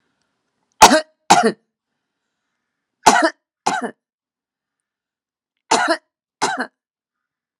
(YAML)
three_cough_length: 7.6 s
three_cough_amplitude: 32768
three_cough_signal_mean_std_ratio: 0.28
survey_phase: alpha (2021-03-01 to 2021-08-12)
age: 45-64
gender: Female
wearing_mask: 'No'
symptom_none: true
smoker_status: Ex-smoker
respiratory_condition_asthma: false
respiratory_condition_other: false
recruitment_source: REACT
submission_delay: 1 day
covid_test_result: Negative
covid_test_method: RT-qPCR